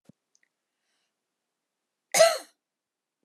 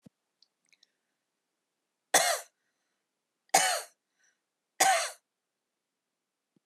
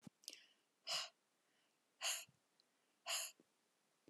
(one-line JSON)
{"cough_length": "3.2 s", "cough_amplitude": 16897, "cough_signal_mean_std_ratio": 0.2, "three_cough_length": "6.7 s", "three_cough_amplitude": 12868, "three_cough_signal_mean_std_ratio": 0.26, "exhalation_length": "4.1 s", "exhalation_amplitude": 1280, "exhalation_signal_mean_std_ratio": 0.35, "survey_phase": "alpha (2021-03-01 to 2021-08-12)", "age": "65+", "gender": "Female", "wearing_mask": "No", "symptom_none": true, "symptom_onset": "12 days", "smoker_status": "Never smoked", "respiratory_condition_asthma": false, "respiratory_condition_other": false, "recruitment_source": "REACT", "submission_delay": "1 day", "covid_test_result": "Negative", "covid_test_method": "RT-qPCR"}